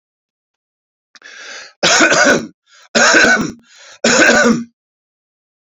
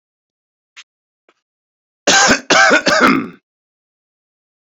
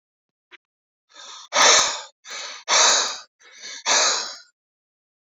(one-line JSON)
{"three_cough_length": "5.7 s", "three_cough_amplitude": 31574, "three_cough_signal_mean_std_ratio": 0.49, "cough_length": "4.7 s", "cough_amplitude": 30144, "cough_signal_mean_std_ratio": 0.39, "exhalation_length": "5.2 s", "exhalation_amplitude": 28464, "exhalation_signal_mean_std_ratio": 0.43, "survey_phase": "beta (2021-08-13 to 2022-03-07)", "age": "45-64", "gender": "Male", "wearing_mask": "No", "symptom_cough_any": true, "symptom_runny_or_blocked_nose": true, "symptom_diarrhoea": true, "symptom_onset": "3 days", "smoker_status": "Current smoker (1 to 10 cigarettes per day)", "respiratory_condition_asthma": false, "respiratory_condition_other": false, "recruitment_source": "Test and Trace", "submission_delay": "2 days", "covid_test_result": "Positive", "covid_test_method": "RT-qPCR"}